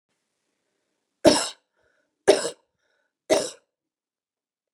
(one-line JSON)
{"three_cough_length": "4.7 s", "three_cough_amplitude": 30131, "three_cough_signal_mean_std_ratio": 0.23, "survey_phase": "beta (2021-08-13 to 2022-03-07)", "age": "45-64", "gender": "Female", "wearing_mask": "No", "symptom_none": true, "smoker_status": "Never smoked", "respiratory_condition_asthma": false, "respiratory_condition_other": false, "recruitment_source": "REACT", "submission_delay": "3 days", "covid_test_result": "Negative", "covid_test_method": "RT-qPCR", "influenza_a_test_result": "Negative", "influenza_b_test_result": "Negative"}